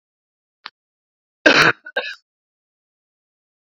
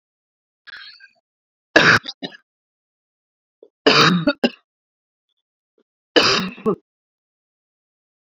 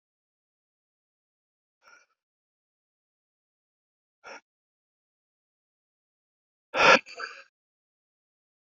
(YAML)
cough_length: 3.8 s
cough_amplitude: 28841
cough_signal_mean_std_ratio: 0.23
three_cough_length: 8.4 s
three_cough_amplitude: 32720
three_cough_signal_mean_std_ratio: 0.3
exhalation_length: 8.6 s
exhalation_amplitude: 17864
exhalation_signal_mean_std_ratio: 0.14
survey_phase: beta (2021-08-13 to 2022-03-07)
age: 18-44
gender: Male
wearing_mask: 'No'
symptom_none: true
symptom_onset: 12 days
smoker_status: Ex-smoker
respiratory_condition_asthma: false
respiratory_condition_other: false
recruitment_source: REACT
submission_delay: 0 days
covid_test_result: Negative
covid_test_method: RT-qPCR